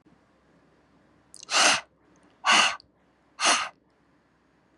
{"exhalation_length": "4.8 s", "exhalation_amplitude": 15883, "exhalation_signal_mean_std_ratio": 0.34, "survey_phase": "beta (2021-08-13 to 2022-03-07)", "age": "18-44", "gender": "Female", "wearing_mask": "No", "symptom_none": true, "smoker_status": "Ex-smoker", "respiratory_condition_asthma": false, "respiratory_condition_other": false, "recruitment_source": "REACT", "submission_delay": "1 day", "covid_test_result": "Negative", "covid_test_method": "RT-qPCR", "influenza_a_test_result": "Negative", "influenza_b_test_result": "Negative"}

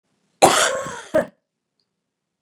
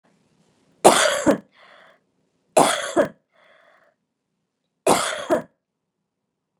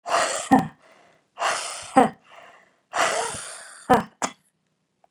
{"cough_length": "2.4 s", "cough_amplitude": 32768, "cough_signal_mean_std_ratio": 0.34, "three_cough_length": "6.6 s", "three_cough_amplitude": 32768, "three_cough_signal_mean_std_ratio": 0.32, "exhalation_length": "5.1 s", "exhalation_amplitude": 26763, "exhalation_signal_mean_std_ratio": 0.4, "survey_phase": "beta (2021-08-13 to 2022-03-07)", "age": "45-64", "gender": "Female", "wearing_mask": "No", "symptom_cough_any": true, "symptom_shortness_of_breath": true, "symptom_fatigue": true, "symptom_headache": true, "symptom_onset": "12 days", "smoker_status": "Ex-smoker", "respiratory_condition_asthma": false, "respiratory_condition_other": false, "recruitment_source": "REACT", "submission_delay": "2 days", "covid_test_result": "Negative", "covid_test_method": "RT-qPCR", "influenza_a_test_result": "Negative", "influenza_b_test_result": "Negative"}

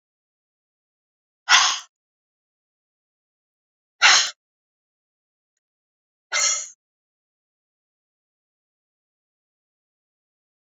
{"exhalation_length": "10.8 s", "exhalation_amplitude": 28912, "exhalation_signal_mean_std_ratio": 0.2, "survey_phase": "beta (2021-08-13 to 2022-03-07)", "age": "45-64", "gender": "Female", "wearing_mask": "No", "symptom_none": true, "smoker_status": "Ex-smoker", "respiratory_condition_asthma": false, "respiratory_condition_other": false, "recruitment_source": "REACT", "submission_delay": "1 day", "covid_test_result": "Negative", "covid_test_method": "RT-qPCR"}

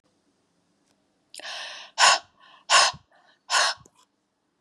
{"exhalation_length": "4.6 s", "exhalation_amplitude": 20204, "exhalation_signal_mean_std_ratio": 0.32, "survey_phase": "beta (2021-08-13 to 2022-03-07)", "age": "45-64", "gender": "Female", "wearing_mask": "No", "symptom_runny_or_blocked_nose": true, "symptom_fatigue": true, "smoker_status": "Never smoked", "respiratory_condition_asthma": false, "respiratory_condition_other": false, "recruitment_source": "Test and Trace", "submission_delay": "2 days", "covid_test_result": "Positive", "covid_test_method": "RT-qPCR"}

